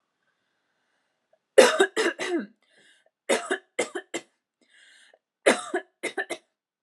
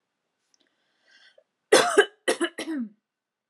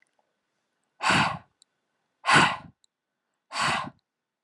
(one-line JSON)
{"three_cough_length": "6.8 s", "three_cough_amplitude": 31253, "three_cough_signal_mean_std_ratio": 0.3, "cough_length": "3.5 s", "cough_amplitude": 21037, "cough_signal_mean_std_ratio": 0.31, "exhalation_length": "4.4 s", "exhalation_amplitude": 16835, "exhalation_signal_mean_std_ratio": 0.35, "survey_phase": "alpha (2021-03-01 to 2021-08-12)", "age": "18-44", "gender": "Female", "wearing_mask": "No", "symptom_none": true, "smoker_status": "Never smoked", "respiratory_condition_asthma": false, "respiratory_condition_other": false, "recruitment_source": "REACT", "submission_delay": "8 days", "covid_test_result": "Negative", "covid_test_method": "RT-qPCR"}